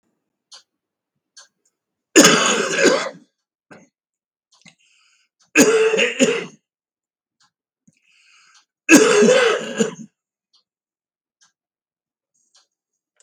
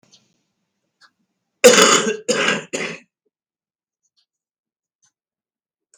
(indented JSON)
{
  "three_cough_length": "13.2 s",
  "three_cough_amplitude": 32768,
  "three_cough_signal_mean_std_ratio": 0.34,
  "cough_length": "6.0 s",
  "cough_amplitude": 32768,
  "cough_signal_mean_std_ratio": 0.28,
  "survey_phase": "beta (2021-08-13 to 2022-03-07)",
  "age": "65+",
  "gender": "Male",
  "wearing_mask": "No",
  "symptom_cough_any": true,
  "smoker_status": "Ex-smoker",
  "respiratory_condition_asthma": false,
  "respiratory_condition_other": false,
  "recruitment_source": "REACT",
  "submission_delay": "1 day",
  "covid_test_result": "Negative",
  "covid_test_method": "RT-qPCR",
  "influenza_a_test_result": "Negative",
  "influenza_b_test_result": "Negative"
}